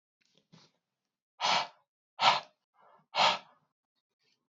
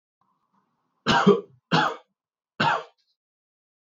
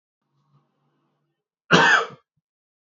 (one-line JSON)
{"exhalation_length": "4.5 s", "exhalation_amplitude": 10587, "exhalation_signal_mean_std_ratio": 0.3, "three_cough_length": "3.8 s", "three_cough_amplitude": 18603, "three_cough_signal_mean_std_ratio": 0.34, "cough_length": "3.0 s", "cough_amplitude": 26531, "cough_signal_mean_std_ratio": 0.27, "survey_phase": "beta (2021-08-13 to 2022-03-07)", "age": "18-44", "gender": "Male", "wearing_mask": "No", "symptom_cough_any": true, "symptom_sore_throat": true, "symptom_diarrhoea": true, "symptom_fever_high_temperature": true, "smoker_status": "Ex-smoker", "respiratory_condition_asthma": false, "respiratory_condition_other": false, "recruitment_source": "Test and Trace", "submission_delay": "2 days", "covid_test_result": "Positive", "covid_test_method": "LFT"}